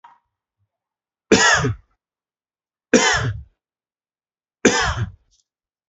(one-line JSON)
{"three_cough_length": "5.9 s", "three_cough_amplitude": 31509, "three_cough_signal_mean_std_ratio": 0.35, "survey_phase": "beta (2021-08-13 to 2022-03-07)", "age": "18-44", "gender": "Male", "wearing_mask": "No", "symptom_runny_or_blocked_nose": true, "symptom_sore_throat": true, "symptom_fatigue": true, "symptom_headache": true, "smoker_status": "Never smoked", "respiratory_condition_asthma": false, "respiratory_condition_other": false, "recruitment_source": "Test and Trace", "submission_delay": "1 day", "covid_test_result": "Positive", "covid_test_method": "RT-qPCR", "covid_ct_value": 15.0, "covid_ct_gene": "ORF1ab gene", "covid_ct_mean": 15.2, "covid_viral_load": "10000000 copies/ml", "covid_viral_load_category": "High viral load (>1M copies/ml)"}